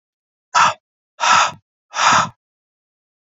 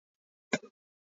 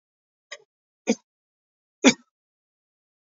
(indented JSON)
{
  "exhalation_length": "3.3 s",
  "exhalation_amplitude": 29606,
  "exhalation_signal_mean_std_ratio": 0.4,
  "cough_length": "1.2 s",
  "cough_amplitude": 6763,
  "cough_signal_mean_std_ratio": 0.15,
  "three_cough_length": "3.2 s",
  "three_cough_amplitude": 26830,
  "three_cough_signal_mean_std_ratio": 0.16,
  "survey_phase": "beta (2021-08-13 to 2022-03-07)",
  "age": "45-64",
  "gender": "Male",
  "wearing_mask": "No",
  "symptom_cough_any": true,
  "symptom_runny_or_blocked_nose": true,
  "smoker_status": "Never smoked",
  "respiratory_condition_asthma": false,
  "respiratory_condition_other": false,
  "recruitment_source": "REACT",
  "submission_delay": "5 days",
  "covid_test_result": "Negative",
  "covid_test_method": "RT-qPCR",
  "influenza_a_test_result": "Negative",
  "influenza_b_test_result": "Negative"
}